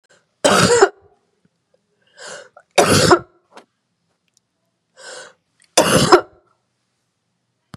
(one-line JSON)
{"three_cough_length": "7.8 s", "three_cough_amplitude": 32768, "three_cough_signal_mean_std_ratio": 0.33, "survey_phase": "beta (2021-08-13 to 2022-03-07)", "age": "65+", "gender": "Female", "wearing_mask": "No", "symptom_none": true, "smoker_status": "Never smoked", "respiratory_condition_asthma": false, "respiratory_condition_other": false, "recruitment_source": "REACT", "submission_delay": "2 days", "covid_test_result": "Negative", "covid_test_method": "RT-qPCR", "influenza_a_test_result": "Negative", "influenza_b_test_result": "Negative"}